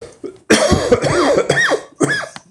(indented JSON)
{
  "cough_length": "2.5 s",
  "cough_amplitude": 26028,
  "cough_signal_mean_std_ratio": 0.73,
  "survey_phase": "beta (2021-08-13 to 2022-03-07)",
  "age": "45-64",
  "gender": "Male",
  "wearing_mask": "No",
  "symptom_cough_any": true,
  "symptom_runny_or_blocked_nose": true,
  "symptom_shortness_of_breath": true,
  "symptom_sore_throat": true,
  "symptom_fatigue": true,
  "symptom_headache": true,
  "symptom_change_to_sense_of_smell_or_taste": true,
  "symptom_loss_of_taste": true,
  "symptom_onset": "7 days",
  "smoker_status": "Ex-smoker",
  "respiratory_condition_asthma": false,
  "respiratory_condition_other": false,
  "recruitment_source": "Test and Trace",
  "submission_delay": "1 day",
  "covid_test_result": "Positive",
  "covid_test_method": "RT-qPCR",
  "covid_ct_value": 23.3,
  "covid_ct_gene": "ORF1ab gene"
}